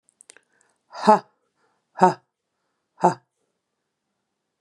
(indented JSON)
{
  "exhalation_length": "4.6 s",
  "exhalation_amplitude": 31117,
  "exhalation_signal_mean_std_ratio": 0.2,
  "survey_phase": "beta (2021-08-13 to 2022-03-07)",
  "age": "45-64",
  "gender": "Female",
  "wearing_mask": "No",
  "symptom_none": true,
  "smoker_status": "Never smoked",
  "respiratory_condition_asthma": false,
  "respiratory_condition_other": false,
  "recruitment_source": "REACT",
  "submission_delay": "1 day",
  "covid_test_result": "Negative",
  "covid_test_method": "RT-qPCR",
  "influenza_a_test_result": "Negative",
  "influenza_b_test_result": "Negative"
}